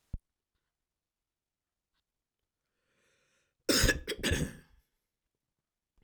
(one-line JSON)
{"cough_length": "6.0 s", "cough_amplitude": 7747, "cough_signal_mean_std_ratio": 0.25, "survey_phase": "alpha (2021-03-01 to 2021-08-12)", "age": "45-64", "gender": "Male", "wearing_mask": "No", "symptom_fatigue": true, "smoker_status": "Never smoked", "respiratory_condition_asthma": false, "respiratory_condition_other": false, "recruitment_source": "Test and Trace", "submission_delay": "2 days", "covid_test_result": "Positive", "covid_test_method": "RT-qPCR", "covid_ct_value": 35.5, "covid_ct_gene": "N gene"}